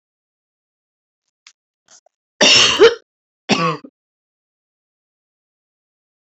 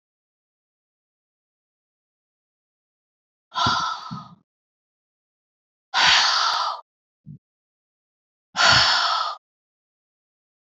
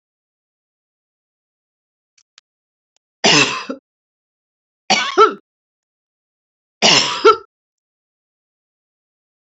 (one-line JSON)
{"cough_length": "6.2 s", "cough_amplitude": 31626, "cough_signal_mean_std_ratio": 0.27, "exhalation_length": "10.7 s", "exhalation_amplitude": 25314, "exhalation_signal_mean_std_ratio": 0.35, "three_cough_length": "9.6 s", "three_cough_amplitude": 32768, "three_cough_signal_mean_std_ratio": 0.26, "survey_phase": "beta (2021-08-13 to 2022-03-07)", "age": "65+", "gender": "Female", "wearing_mask": "No", "symptom_runny_or_blocked_nose": true, "smoker_status": "Never smoked", "respiratory_condition_asthma": false, "respiratory_condition_other": true, "recruitment_source": "REACT", "submission_delay": "2 days", "covid_test_result": "Negative", "covid_test_method": "RT-qPCR", "influenza_a_test_result": "Negative", "influenza_b_test_result": "Negative"}